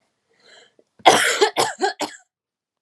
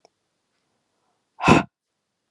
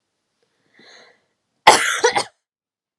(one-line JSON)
{"three_cough_length": "2.8 s", "three_cough_amplitude": 32768, "three_cough_signal_mean_std_ratio": 0.38, "exhalation_length": "2.3 s", "exhalation_amplitude": 31772, "exhalation_signal_mean_std_ratio": 0.22, "cough_length": "3.0 s", "cough_amplitude": 32768, "cough_signal_mean_std_ratio": 0.28, "survey_phase": "beta (2021-08-13 to 2022-03-07)", "age": "18-44", "gender": "Female", "wearing_mask": "No", "symptom_none": true, "smoker_status": "Never smoked", "respiratory_condition_asthma": true, "respiratory_condition_other": false, "recruitment_source": "REACT", "submission_delay": "2 days", "covid_test_result": "Negative", "covid_test_method": "RT-qPCR"}